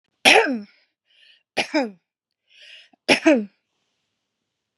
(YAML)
three_cough_length: 4.8 s
three_cough_amplitude: 32767
three_cough_signal_mean_std_ratio: 0.31
survey_phase: beta (2021-08-13 to 2022-03-07)
age: 65+
gender: Female
wearing_mask: 'No'
symptom_none: true
smoker_status: Ex-smoker
respiratory_condition_asthma: false
respiratory_condition_other: false
recruitment_source: REACT
submission_delay: 1 day
covid_test_result: Negative
covid_test_method: RT-qPCR
influenza_a_test_result: Negative
influenza_b_test_result: Negative